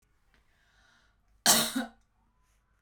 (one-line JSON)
{"cough_length": "2.8 s", "cough_amplitude": 14854, "cough_signal_mean_std_ratio": 0.27, "survey_phase": "beta (2021-08-13 to 2022-03-07)", "age": "18-44", "gender": "Female", "wearing_mask": "No", "symptom_fatigue": true, "symptom_headache": true, "smoker_status": "Ex-smoker", "respiratory_condition_asthma": false, "respiratory_condition_other": false, "recruitment_source": "REACT", "submission_delay": "7 days", "covid_test_result": "Negative", "covid_test_method": "RT-qPCR"}